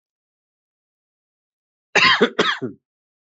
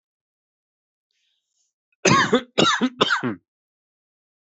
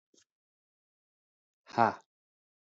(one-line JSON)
{"cough_length": "3.3 s", "cough_amplitude": 28764, "cough_signal_mean_std_ratio": 0.31, "three_cough_length": "4.4 s", "three_cough_amplitude": 23671, "three_cough_signal_mean_std_ratio": 0.36, "exhalation_length": "2.6 s", "exhalation_amplitude": 10371, "exhalation_signal_mean_std_ratio": 0.16, "survey_phase": "alpha (2021-03-01 to 2021-08-12)", "age": "18-44", "gender": "Male", "wearing_mask": "No", "symptom_cough_any": true, "symptom_new_continuous_cough": true, "symptom_fatigue": true, "symptom_fever_high_temperature": true, "symptom_headache": true, "symptom_onset": "4 days", "smoker_status": "Never smoked", "respiratory_condition_asthma": false, "respiratory_condition_other": false, "recruitment_source": "Test and Trace", "submission_delay": "2 days", "covid_test_result": "Positive", "covid_test_method": "RT-qPCR"}